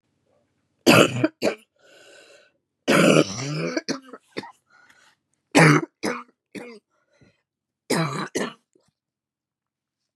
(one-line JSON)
{"three_cough_length": "10.2 s", "three_cough_amplitude": 32626, "three_cough_signal_mean_std_ratio": 0.34, "survey_phase": "beta (2021-08-13 to 2022-03-07)", "age": "18-44", "gender": "Female", "wearing_mask": "No", "symptom_cough_any": true, "symptom_runny_or_blocked_nose": true, "symptom_shortness_of_breath": true, "symptom_headache": true, "smoker_status": "Current smoker (e-cigarettes or vapes only)", "respiratory_condition_asthma": false, "respiratory_condition_other": false, "recruitment_source": "Test and Trace", "submission_delay": "2 days", "covid_test_result": "Positive", "covid_test_method": "RT-qPCR", "covid_ct_value": 16.0, "covid_ct_gene": "ORF1ab gene", "covid_ct_mean": 16.4, "covid_viral_load": "4100000 copies/ml", "covid_viral_load_category": "High viral load (>1M copies/ml)"}